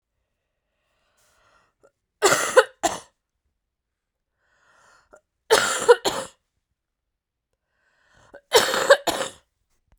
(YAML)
three_cough_length: 10.0 s
three_cough_amplitude: 32768
three_cough_signal_mean_std_ratio: 0.27
survey_phase: beta (2021-08-13 to 2022-03-07)
age: 18-44
gender: Female
wearing_mask: 'No'
symptom_cough_any: true
symptom_runny_or_blocked_nose: true
symptom_fatigue: true
symptom_other: true
symptom_onset: 4 days
smoker_status: Never smoked
respiratory_condition_asthma: false
respiratory_condition_other: false
recruitment_source: Test and Trace
submission_delay: 1 day
covid_test_result: Positive
covid_test_method: RT-qPCR